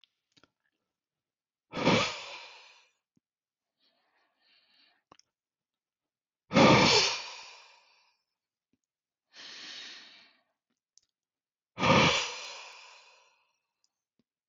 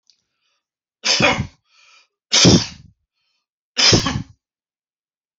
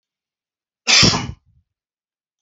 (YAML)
exhalation_length: 14.5 s
exhalation_amplitude: 11277
exhalation_signal_mean_std_ratio: 0.27
three_cough_length: 5.4 s
three_cough_amplitude: 30112
three_cough_signal_mean_std_ratio: 0.35
cough_length: 2.4 s
cough_amplitude: 31202
cough_signal_mean_std_ratio: 0.31
survey_phase: alpha (2021-03-01 to 2021-08-12)
age: 45-64
gender: Male
wearing_mask: 'No'
symptom_none: true
smoker_status: Never smoked
respiratory_condition_asthma: false
respiratory_condition_other: false
recruitment_source: REACT
submission_delay: 1 day
covid_test_result: Negative
covid_test_method: RT-qPCR